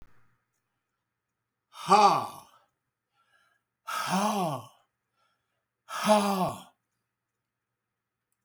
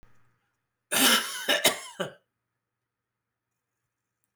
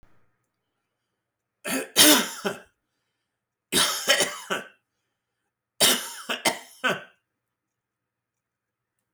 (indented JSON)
{
  "exhalation_length": "8.4 s",
  "exhalation_amplitude": 15490,
  "exhalation_signal_mean_std_ratio": 0.33,
  "cough_length": "4.4 s",
  "cough_amplitude": 13195,
  "cough_signal_mean_std_ratio": 0.33,
  "three_cough_length": "9.1 s",
  "three_cough_amplitude": 27926,
  "three_cough_signal_mean_std_ratio": 0.32,
  "survey_phase": "beta (2021-08-13 to 2022-03-07)",
  "age": "65+",
  "gender": "Male",
  "wearing_mask": "No",
  "symptom_change_to_sense_of_smell_or_taste": true,
  "symptom_loss_of_taste": true,
  "symptom_onset": "5 days",
  "smoker_status": "Never smoked",
  "respiratory_condition_asthma": false,
  "respiratory_condition_other": false,
  "recruitment_source": "Test and Trace",
  "submission_delay": "1 day",
  "covid_test_result": "Positive",
  "covid_test_method": "ePCR"
}